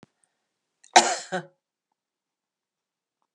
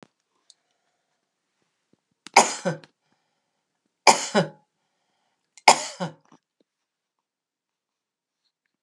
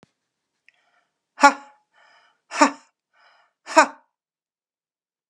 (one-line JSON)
{"cough_length": "3.3 s", "cough_amplitude": 31104, "cough_signal_mean_std_ratio": 0.18, "three_cough_length": "8.8 s", "three_cough_amplitude": 32768, "three_cough_signal_mean_std_ratio": 0.19, "exhalation_length": "5.3 s", "exhalation_amplitude": 32767, "exhalation_signal_mean_std_ratio": 0.18, "survey_phase": "beta (2021-08-13 to 2022-03-07)", "age": "65+", "gender": "Female", "wearing_mask": "No", "symptom_none": true, "smoker_status": "Ex-smoker", "respiratory_condition_asthma": false, "respiratory_condition_other": false, "recruitment_source": "REACT", "submission_delay": "3 days", "covid_test_result": "Negative", "covid_test_method": "RT-qPCR", "influenza_a_test_result": "Negative", "influenza_b_test_result": "Negative"}